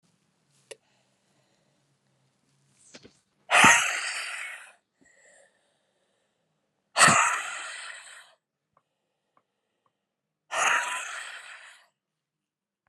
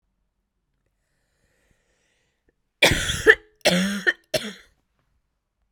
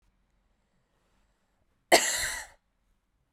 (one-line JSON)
{"exhalation_length": "12.9 s", "exhalation_amplitude": 23092, "exhalation_signal_mean_std_ratio": 0.29, "three_cough_length": "5.7 s", "three_cough_amplitude": 32768, "three_cough_signal_mean_std_ratio": 0.29, "cough_length": "3.3 s", "cough_amplitude": 19925, "cough_signal_mean_std_ratio": 0.24, "survey_phase": "beta (2021-08-13 to 2022-03-07)", "age": "18-44", "gender": "Female", "wearing_mask": "No", "symptom_cough_any": true, "symptom_runny_or_blocked_nose": true, "symptom_shortness_of_breath": true, "symptom_sore_throat": true, "symptom_fatigue": true, "symptom_headache": true, "smoker_status": "Current smoker (e-cigarettes or vapes only)", "respiratory_condition_asthma": false, "respiratory_condition_other": false, "recruitment_source": "Test and Trace", "submission_delay": "2 days", "covid_test_result": "Positive", "covid_test_method": "RT-qPCR", "covid_ct_value": 28.1, "covid_ct_gene": "ORF1ab gene"}